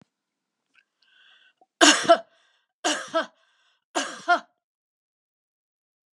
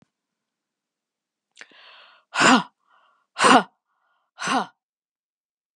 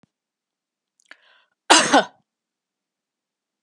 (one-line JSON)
{"three_cough_length": "6.1 s", "three_cough_amplitude": 30682, "three_cough_signal_mean_std_ratio": 0.25, "exhalation_length": "5.8 s", "exhalation_amplitude": 30275, "exhalation_signal_mean_std_ratio": 0.26, "cough_length": "3.6 s", "cough_amplitude": 32767, "cough_signal_mean_std_ratio": 0.22, "survey_phase": "beta (2021-08-13 to 2022-03-07)", "age": "45-64", "gender": "Female", "wearing_mask": "No", "symptom_none": true, "smoker_status": "Ex-smoker", "respiratory_condition_asthma": false, "respiratory_condition_other": false, "recruitment_source": "REACT", "submission_delay": "1 day", "covid_test_result": "Negative", "covid_test_method": "RT-qPCR", "influenza_a_test_result": "Negative", "influenza_b_test_result": "Negative"}